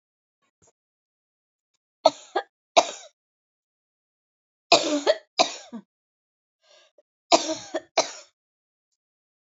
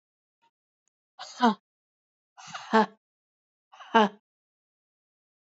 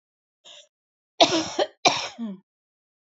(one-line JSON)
{"three_cough_length": "9.6 s", "three_cough_amplitude": 27498, "three_cough_signal_mean_std_ratio": 0.23, "exhalation_length": "5.5 s", "exhalation_amplitude": 19932, "exhalation_signal_mean_std_ratio": 0.22, "cough_length": "3.2 s", "cough_amplitude": 30642, "cough_signal_mean_std_ratio": 0.32, "survey_phase": "alpha (2021-03-01 to 2021-08-12)", "age": "45-64", "gender": "Female", "wearing_mask": "No", "symptom_fatigue": true, "symptom_change_to_sense_of_smell_or_taste": true, "smoker_status": "Ex-smoker", "respiratory_condition_asthma": false, "respiratory_condition_other": false, "recruitment_source": "REACT", "submission_delay": "3 days", "covid_test_result": "Negative", "covid_test_method": "RT-qPCR"}